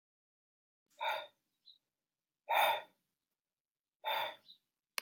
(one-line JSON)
{"exhalation_length": "5.0 s", "exhalation_amplitude": 4370, "exhalation_signal_mean_std_ratio": 0.31, "survey_phase": "alpha (2021-03-01 to 2021-08-12)", "age": "18-44", "gender": "Male", "wearing_mask": "No", "symptom_none": true, "smoker_status": "Never smoked", "respiratory_condition_asthma": false, "respiratory_condition_other": false, "recruitment_source": "REACT", "submission_delay": "6 days", "covid_test_result": "Negative", "covid_test_method": "RT-qPCR"}